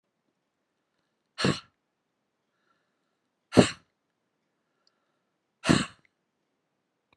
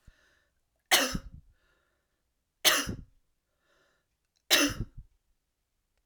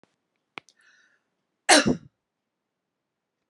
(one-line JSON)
{"exhalation_length": "7.2 s", "exhalation_amplitude": 27375, "exhalation_signal_mean_std_ratio": 0.17, "three_cough_length": "6.1 s", "three_cough_amplitude": 15215, "three_cough_signal_mean_std_ratio": 0.28, "cough_length": "3.5 s", "cough_amplitude": 25316, "cough_signal_mean_std_ratio": 0.2, "survey_phase": "alpha (2021-03-01 to 2021-08-12)", "age": "65+", "gender": "Female", "wearing_mask": "No", "symptom_none": true, "smoker_status": "Never smoked", "respiratory_condition_asthma": false, "respiratory_condition_other": false, "recruitment_source": "REACT", "submission_delay": "1 day", "covid_test_result": "Negative", "covid_test_method": "RT-qPCR"}